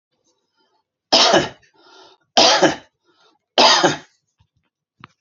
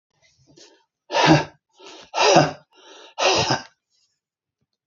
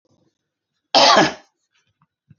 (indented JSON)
{
  "three_cough_length": "5.2 s",
  "three_cough_amplitude": 32767,
  "three_cough_signal_mean_std_ratio": 0.37,
  "exhalation_length": "4.9 s",
  "exhalation_amplitude": 28852,
  "exhalation_signal_mean_std_ratio": 0.37,
  "cough_length": "2.4 s",
  "cough_amplitude": 29222,
  "cough_signal_mean_std_ratio": 0.32,
  "survey_phase": "beta (2021-08-13 to 2022-03-07)",
  "age": "65+",
  "gender": "Male",
  "wearing_mask": "No",
  "symptom_none": true,
  "smoker_status": "Never smoked",
  "respiratory_condition_asthma": false,
  "respiratory_condition_other": false,
  "recruitment_source": "REACT",
  "submission_delay": "2 days",
  "covid_test_result": "Negative",
  "covid_test_method": "RT-qPCR",
  "influenza_a_test_result": "Negative",
  "influenza_b_test_result": "Negative"
}